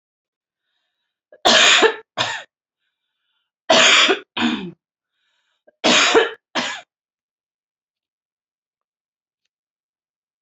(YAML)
three_cough_length: 10.4 s
three_cough_amplitude: 29015
three_cough_signal_mean_std_ratio: 0.34
survey_phase: beta (2021-08-13 to 2022-03-07)
age: 18-44
gender: Female
wearing_mask: 'No'
symptom_none: true
smoker_status: Never smoked
respiratory_condition_asthma: false
respiratory_condition_other: false
recruitment_source: REACT
submission_delay: 4 days
covid_test_result: Negative
covid_test_method: RT-qPCR
influenza_a_test_result: Negative
influenza_b_test_result: Negative